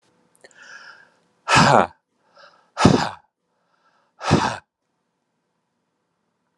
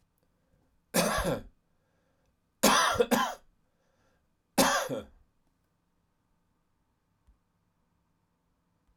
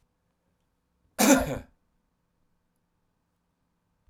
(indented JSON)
{
  "exhalation_length": "6.6 s",
  "exhalation_amplitude": 32768,
  "exhalation_signal_mean_std_ratio": 0.29,
  "three_cough_length": "9.0 s",
  "three_cough_amplitude": 14179,
  "three_cough_signal_mean_std_ratio": 0.32,
  "cough_length": "4.1 s",
  "cough_amplitude": 15133,
  "cough_signal_mean_std_ratio": 0.22,
  "survey_phase": "alpha (2021-03-01 to 2021-08-12)",
  "age": "65+",
  "gender": "Male",
  "wearing_mask": "No",
  "symptom_none": true,
  "smoker_status": "Never smoked",
  "respiratory_condition_asthma": false,
  "respiratory_condition_other": false,
  "recruitment_source": "REACT",
  "submission_delay": "1 day",
  "covid_test_result": "Negative",
  "covid_test_method": "RT-qPCR"
}